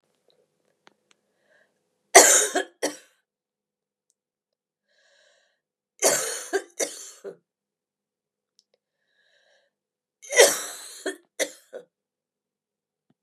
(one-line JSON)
{"three_cough_length": "13.2 s", "three_cough_amplitude": 32768, "three_cough_signal_mean_std_ratio": 0.22, "survey_phase": "beta (2021-08-13 to 2022-03-07)", "age": "45-64", "gender": "Female", "wearing_mask": "No", "symptom_cough_any": true, "symptom_runny_or_blocked_nose": true, "symptom_fatigue": true, "symptom_headache": true, "symptom_onset": "6 days", "smoker_status": "Never smoked", "respiratory_condition_asthma": false, "respiratory_condition_other": false, "recruitment_source": "Test and Trace", "submission_delay": "2 days", "covid_test_result": "Negative", "covid_test_method": "RT-qPCR"}